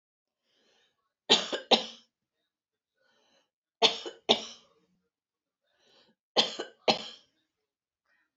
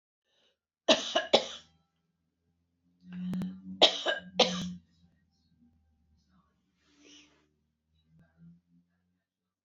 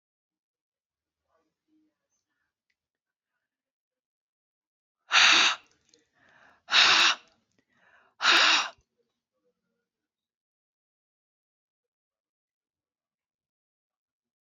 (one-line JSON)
{"three_cough_length": "8.4 s", "three_cough_amplitude": 19395, "three_cough_signal_mean_std_ratio": 0.23, "cough_length": "9.6 s", "cough_amplitude": 15679, "cough_signal_mean_std_ratio": 0.27, "exhalation_length": "14.4 s", "exhalation_amplitude": 16064, "exhalation_signal_mean_std_ratio": 0.24, "survey_phase": "beta (2021-08-13 to 2022-03-07)", "age": "65+", "gender": "Female", "wearing_mask": "No", "symptom_cough_any": true, "smoker_status": "Never smoked", "respiratory_condition_asthma": false, "respiratory_condition_other": false, "recruitment_source": "Test and Trace", "submission_delay": "1 day", "covid_test_result": "Negative", "covid_test_method": "LFT"}